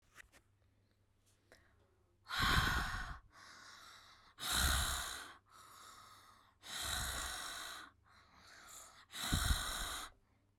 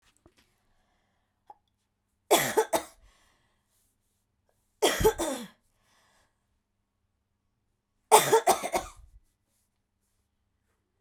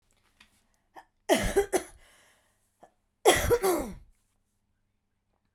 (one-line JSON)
{"exhalation_length": "10.6 s", "exhalation_amplitude": 3145, "exhalation_signal_mean_std_ratio": 0.5, "three_cough_length": "11.0 s", "three_cough_amplitude": 22256, "three_cough_signal_mean_std_ratio": 0.25, "cough_length": "5.5 s", "cough_amplitude": 19501, "cough_signal_mean_std_ratio": 0.33, "survey_phase": "beta (2021-08-13 to 2022-03-07)", "age": "18-44", "gender": "Female", "wearing_mask": "Yes", "symptom_cough_any": true, "symptom_runny_or_blocked_nose": true, "symptom_sore_throat": true, "symptom_fatigue": true, "symptom_headache": true, "symptom_change_to_sense_of_smell_or_taste": true, "symptom_loss_of_taste": true, "symptom_onset": "4 days", "smoker_status": "Never smoked", "respiratory_condition_asthma": false, "respiratory_condition_other": false, "recruitment_source": "Test and Trace", "submission_delay": "2 days", "covid_test_result": "Positive", "covid_test_method": "RT-qPCR", "covid_ct_value": 14.6, "covid_ct_gene": "ORF1ab gene"}